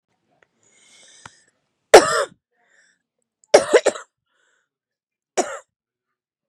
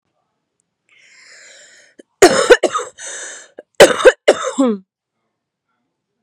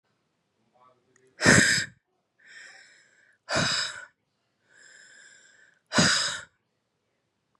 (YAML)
three_cough_length: 6.5 s
three_cough_amplitude: 32768
three_cough_signal_mean_std_ratio: 0.21
cough_length: 6.2 s
cough_amplitude: 32768
cough_signal_mean_std_ratio: 0.31
exhalation_length: 7.6 s
exhalation_amplitude: 23493
exhalation_signal_mean_std_ratio: 0.32
survey_phase: beta (2021-08-13 to 2022-03-07)
age: 18-44
gender: Female
wearing_mask: 'No'
symptom_cough_any: true
symptom_runny_or_blocked_nose: true
symptom_shortness_of_breath: true
symptom_sore_throat: true
symptom_abdominal_pain: true
symptom_fatigue: true
symptom_fever_high_temperature: true
symptom_headache: true
symptom_change_to_sense_of_smell_or_taste: true
symptom_loss_of_taste: true
symptom_onset: 6 days
smoker_status: Ex-smoker
respiratory_condition_asthma: false
respiratory_condition_other: false
recruitment_source: Test and Trace
submission_delay: 1 day
covid_test_result: Positive
covid_test_method: RT-qPCR
covid_ct_value: 15.3
covid_ct_gene: ORF1ab gene
covid_ct_mean: 15.6
covid_viral_load: 7700000 copies/ml
covid_viral_load_category: High viral load (>1M copies/ml)